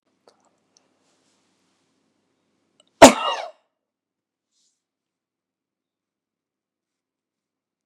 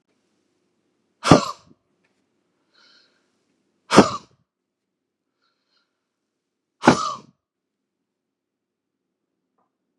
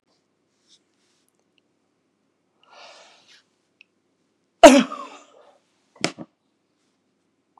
{"cough_length": "7.9 s", "cough_amplitude": 32768, "cough_signal_mean_std_ratio": 0.11, "exhalation_length": "10.0 s", "exhalation_amplitude": 32768, "exhalation_signal_mean_std_ratio": 0.17, "three_cough_length": "7.6 s", "three_cough_amplitude": 32768, "three_cough_signal_mean_std_ratio": 0.14, "survey_phase": "beta (2021-08-13 to 2022-03-07)", "age": "45-64", "gender": "Male", "wearing_mask": "No", "symptom_cough_any": true, "symptom_runny_or_blocked_nose": true, "symptom_sore_throat": true, "symptom_fatigue": true, "symptom_change_to_sense_of_smell_or_taste": true, "symptom_onset": "3 days", "smoker_status": "Never smoked", "respiratory_condition_asthma": true, "respiratory_condition_other": false, "recruitment_source": "Test and Trace", "submission_delay": "1 day", "covid_test_result": "Negative", "covid_test_method": "RT-qPCR"}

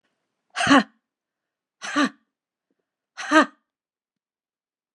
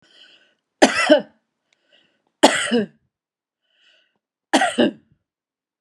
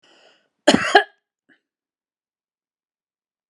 {"exhalation_length": "4.9 s", "exhalation_amplitude": 29490, "exhalation_signal_mean_std_ratio": 0.26, "three_cough_length": "5.8 s", "three_cough_amplitude": 32768, "three_cough_signal_mean_std_ratio": 0.31, "cough_length": "3.5 s", "cough_amplitude": 32728, "cough_signal_mean_std_ratio": 0.2, "survey_phase": "beta (2021-08-13 to 2022-03-07)", "age": "65+", "gender": "Female", "wearing_mask": "No", "symptom_none": true, "smoker_status": "Ex-smoker", "respiratory_condition_asthma": false, "respiratory_condition_other": false, "recruitment_source": "REACT", "submission_delay": "1 day", "covid_test_result": "Negative", "covid_test_method": "RT-qPCR"}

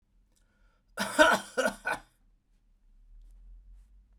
{"cough_length": "4.2 s", "cough_amplitude": 16648, "cough_signal_mean_std_ratio": 0.3, "survey_phase": "beta (2021-08-13 to 2022-03-07)", "age": "45-64", "gender": "Male", "wearing_mask": "No", "symptom_cough_any": true, "symptom_runny_or_blocked_nose": true, "symptom_sore_throat": true, "symptom_fatigue": true, "symptom_headache": true, "symptom_other": true, "symptom_onset": "4 days", "smoker_status": "Ex-smoker", "respiratory_condition_asthma": false, "respiratory_condition_other": false, "recruitment_source": "Test and Trace", "submission_delay": "1 day", "covid_test_result": "Positive", "covid_test_method": "ePCR"}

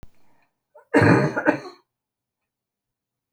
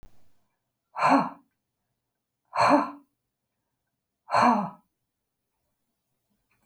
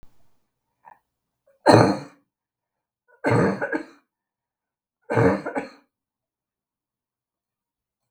{"cough_length": "3.3 s", "cough_amplitude": 31599, "cough_signal_mean_std_ratio": 0.33, "exhalation_length": "6.7 s", "exhalation_amplitude": 14464, "exhalation_signal_mean_std_ratio": 0.31, "three_cough_length": "8.1 s", "three_cough_amplitude": 32768, "three_cough_signal_mean_std_ratio": 0.29, "survey_phase": "beta (2021-08-13 to 2022-03-07)", "age": "65+", "gender": "Female", "wearing_mask": "No", "symptom_none": true, "smoker_status": "Never smoked", "respiratory_condition_asthma": false, "respiratory_condition_other": false, "recruitment_source": "REACT", "submission_delay": "2 days", "covid_test_result": "Negative", "covid_test_method": "RT-qPCR", "influenza_a_test_result": "Negative", "influenza_b_test_result": "Negative"}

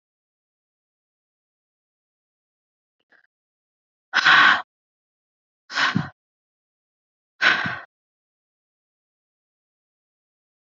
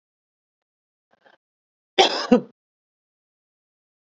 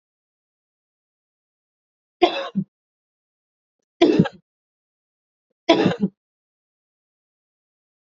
{"exhalation_length": "10.8 s", "exhalation_amplitude": 26286, "exhalation_signal_mean_std_ratio": 0.23, "cough_length": "4.0 s", "cough_amplitude": 29315, "cough_signal_mean_std_ratio": 0.2, "three_cough_length": "8.0 s", "three_cough_amplitude": 29143, "three_cough_signal_mean_std_ratio": 0.24, "survey_phase": "beta (2021-08-13 to 2022-03-07)", "age": "45-64", "gender": "Female", "wearing_mask": "No", "symptom_none": true, "smoker_status": "Current smoker (1 to 10 cigarettes per day)", "respiratory_condition_asthma": false, "respiratory_condition_other": false, "recruitment_source": "REACT", "submission_delay": "7 days", "covid_test_result": "Negative", "covid_test_method": "RT-qPCR"}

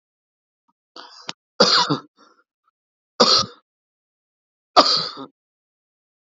{"three_cough_length": "6.2 s", "three_cough_amplitude": 30452, "three_cough_signal_mean_std_ratio": 0.29, "survey_phase": "beta (2021-08-13 to 2022-03-07)", "age": "45-64", "gender": "Male", "wearing_mask": "No", "symptom_none": true, "smoker_status": "Never smoked", "respiratory_condition_asthma": false, "respiratory_condition_other": false, "recruitment_source": "REACT", "submission_delay": "1 day", "covid_test_result": "Negative", "covid_test_method": "RT-qPCR", "influenza_a_test_result": "Negative", "influenza_b_test_result": "Negative"}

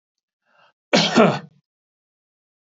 {"cough_length": "2.6 s", "cough_amplitude": 27419, "cough_signal_mean_std_ratio": 0.31, "survey_phase": "beta (2021-08-13 to 2022-03-07)", "age": "65+", "gender": "Male", "wearing_mask": "No", "symptom_none": true, "smoker_status": "Never smoked", "respiratory_condition_asthma": false, "respiratory_condition_other": false, "recruitment_source": "REACT", "submission_delay": "7 days", "covid_test_result": "Negative", "covid_test_method": "RT-qPCR", "influenza_a_test_result": "Negative", "influenza_b_test_result": "Negative"}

